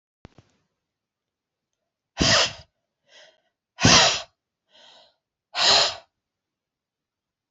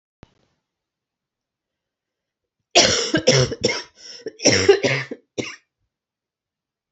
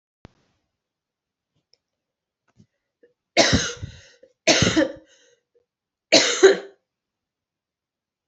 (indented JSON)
{
  "exhalation_length": "7.5 s",
  "exhalation_amplitude": 26081,
  "exhalation_signal_mean_std_ratio": 0.29,
  "cough_length": "6.9 s",
  "cough_amplitude": 32768,
  "cough_signal_mean_std_ratio": 0.35,
  "three_cough_length": "8.3 s",
  "three_cough_amplitude": 31606,
  "three_cough_signal_mean_std_ratio": 0.28,
  "survey_phase": "beta (2021-08-13 to 2022-03-07)",
  "age": "18-44",
  "gender": "Female",
  "wearing_mask": "No",
  "symptom_cough_any": true,
  "symptom_runny_or_blocked_nose": true,
  "symptom_onset": "3 days",
  "smoker_status": "Never smoked",
  "respiratory_condition_asthma": false,
  "respiratory_condition_other": false,
  "recruitment_source": "Test and Trace",
  "submission_delay": "1 day",
  "covid_test_result": "Negative",
  "covid_test_method": "ePCR"
}